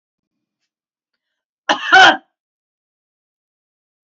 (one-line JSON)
{"cough_length": "4.2 s", "cough_amplitude": 29373, "cough_signal_mean_std_ratio": 0.23, "survey_phase": "beta (2021-08-13 to 2022-03-07)", "age": "65+", "gender": "Female", "wearing_mask": "No", "symptom_none": true, "symptom_onset": "6 days", "smoker_status": "Ex-smoker", "respiratory_condition_asthma": false, "respiratory_condition_other": false, "recruitment_source": "REACT", "submission_delay": "2 days", "covid_test_result": "Negative", "covid_test_method": "RT-qPCR", "influenza_a_test_result": "Negative", "influenza_b_test_result": "Negative"}